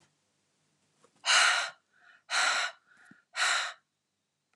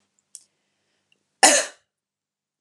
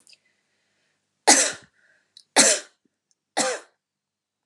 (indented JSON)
{
  "exhalation_length": "4.6 s",
  "exhalation_amplitude": 9862,
  "exhalation_signal_mean_std_ratio": 0.41,
  "cough_length": "2.6 s",
  "cough_amplitude": 31692,
  "cough_signal_mean_std_ratio": 0.22,
  "three_cough_length": "4.5 s",
  "three_cough_amplitude": 28520,
  "three_cough_signal_mean_std_ratio": 0.28,
  "survey_phase": "beta (2021-08-13 to 2022-03-07)",
  "age": "45-64",
  "gender": "Female",
  "wearing_mask": "No",
  "symptom_none": true,
  "smoker_status": "Never smoked",
  "respiratory_condition_asthma": false,
  "respiratory_condition_other": false,
  "recruitment_source": "REACT",
  "submission_delay": "2 days",
  "covid_test_result": "Negative",
  "covid_test_method": "RT-qPCR",
  "influenza_a_test_result": "Negative",
  "influenza_b_test_result": "Negative"
}